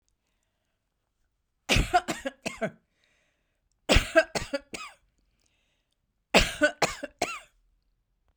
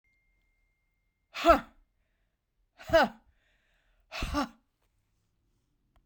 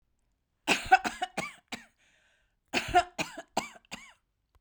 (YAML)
three_cough_length: 8.4 s
three_cough_amplitude: 24322
three_cough_signal_mean_std_ratio: 0.29
exhalation_length: 6.1 s
exhalation_amplitude: 14211
exhalation_signal_mean_std_ratio: 0.23
cough_length: 4.6 s
cough_amplitude: 15103
cough_signal_mean_std_ratio: 0.3
survey_phase: beta (2021-08-13 to 2022-03-07)
age: 65+
gender: Female
wearing_mask: 'No'
symptom_fatigue: true
symptom_onset: 12 days
smoker_status: Never smoked
respiratory_condition_asthma: false
respiratory_condition_other: false
recruitment_source: REACT
submission_delay: 0 days
covid_test_result: Negative
covid_test_method: RT-qPCR